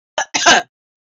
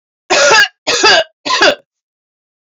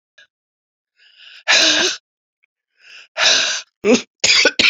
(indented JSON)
{
  "cough_length": "1.0 s",
  "cough_amplitude": 29896,
  "cough_signal_mean_std_ratio": 0.44,
  "three_cough_length": "2.6 s",
  "three_cough_amplitude": 32767,
  "three_cough_signal_mean_std_ratio": 0.56,
  "exhalation_length": "4.7 s",
  "exhalation_amplitude": 31922,
  "exhalation_signal_mean_std_ratio": 0.46,
  "survey_phase": "beta (2021-08-13 to 2022-03-07)",
  "age": "65+",
  "gender": "Male",
  "wearing_mask": "No",
  "symptom_cough_any": true,
  "symptom_runny_or_blocked_nose": true,
  "symptom_sore_throat": true,
  "smoker_status": "Never smoked",
  "respiratory_condition_asthma": false,
  "respiratory_condition_other": false,
  "recruitment_source": "Test and Trace",
  "submission_delay": "2 days",
  "covid_test_result": "Positive",
  "covid_test_method": "RT-qPCR",
  "covid_ct_value": 21.1,
  "covid_ct_gene": "ORF1ab gene"
}